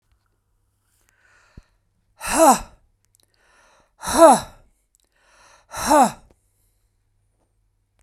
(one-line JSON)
{"exhalation_length": "8.0 s", "exhalation_amplitude": 32767, "exhalation_signal_mean_std_ratio": 0.26, "survey_phase": "beta (2021-08-13 to 2022-03-07)", "age": "45-64", "gender": "Male", "wearing_mask": "No", "symptom_none": true, "smoker_status": "Never smoked", "respiratory_condition_asthma": false, "respiratory_condition_other": false, "recruitment_source": "REACT", "submission_delay": "2 days", "covid_test_result": "Negative", "covid_test_method": "RT-qPCR"}